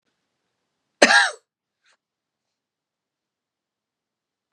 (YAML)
cough_length: 4.5 s
cough_amplitude: 32768
cough_signal_mean_std_ratio: 0.18
survey_phase: beta (2021-08-13 to 2022-03-07)
age: 65+
gender: Female
wearing_mask: 'No'
symptom_none: true
smoker_status: Never smoked
respiratory_condition_asthma: true
respiratory_condition_other: false
recruitment_source: REACT
submission_delay: 1 day
covid_test_result: Negative
covid_test_method: RT-qPCR
influenza_a_test_result: Negative
influenza_b_test_result: Negative